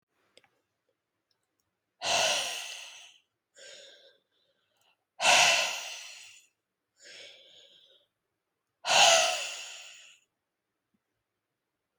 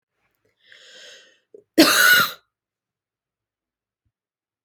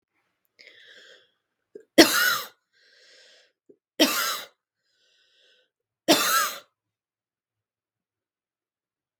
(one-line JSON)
{"exhalation_length": "12.0 s", "exhalation_amplitude": 13137, "exhalation_signal_mean_std_ratio": 0.32, "cough_length": "4.6 s", "cough_amplitude": 32767, "cough_signal_mean_std_ratio": 0.27, "three_cough_length": "9.2 s", "three_cough_amplitude": 32767, "three_cough_signal_mean_std_ratio": 0.26, "survey_phase": "beta (2021-08-13 to 2022-03-07)", "age": "18-44", "gender": "Female", "wearing_mask": "No", "symptom_none": true, "smoker_status": "Never smoked", "respiratory_condition_asthma": false, "respiratory_condition_other": false, "recruitment_source": "REACT", "submission_delay": "2 days", "covid_test_result": "Negative", "covid_test_method": "RT-qPCR"}